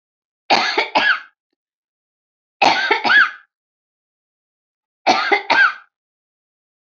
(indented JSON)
{
  "three_cough_length": "7.0 s",
  "three_cough_amplitude": 27520,
  "three_cough_signal_mean_std_ratio": 0.4,
  "survey_phase": "beta (2021-08-13 to 2022-03-07)",
  "age": "18-44",
  "gender": "Female",
  "wearing_mask": "No",
  "symptom_none": true,
  "symptom_onset": "11 days",
  "smoker_status": "Ex-smoker",
  "respiratory_condition_asthma": true,
  "respiratory_condition_other": false,
  "recruitment_source": "REACT",
  "submission_delay": "8 days",
  "covid_test_result": "Negative",
  "covid_test_method": "RT-qPCR",
  "influenza_a_test_result": "Negative",
  "influenza_b_test_result": "Negative"
}